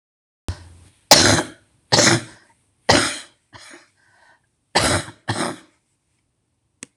three_cough_length: 7.0 s
three_cough_amplitude: 26028
three_cough_signal_mean_std_ratio: 0.34
survey_phase: beta (2021-08-13 to 2022-03-07)
age: 65+
gender: Female
wearing_mask: 'No'
symptom_cough_any: true
symptom_shortness_of_breath: true
symptom_sore_throat: true
symptom_fatigue: true
symptom_loss_of_taste: true
symptom_onset: 12 days
smoker_status: Never smoked
respiratory_condition_asthma: false
respiratory_condition_other: true
recruitment_source: REACT
submission_delay: 2 days
covid_test_result: Negative
covid_test_method: RT-qPCR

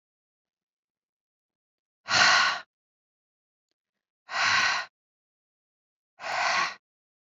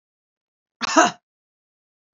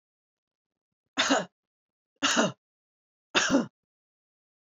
exhalation_length: 7.3 s
exhalation_amplitude: 14273
exhalation_signal_mean_std_ratio: 0.35
cough_length: 2.1 s
cough_amplitude: 26453
cough_signal_mean_std_ratio: 0.24
three_cough_length: 4.8 s
three_cough_amplitude: 11906
three_cough_signal_mean_std_ratio: 0.33
survey_phase: beta (2021-08-13 to 2022-03-07)
age: 45-64
gender: Female
wearing_mask: 'No'
symptom_none: true
smoker_status: Ex-smoker
respiratory_condition_asthma: false
respiratory_condition_other: false
recruitment_source: REACT
submission_delay: 0 days
covid_test_result: Negative
covid_test_method: RT-qPCR
influenza_a_test_result: Negative
influenza_b_test_result: Negative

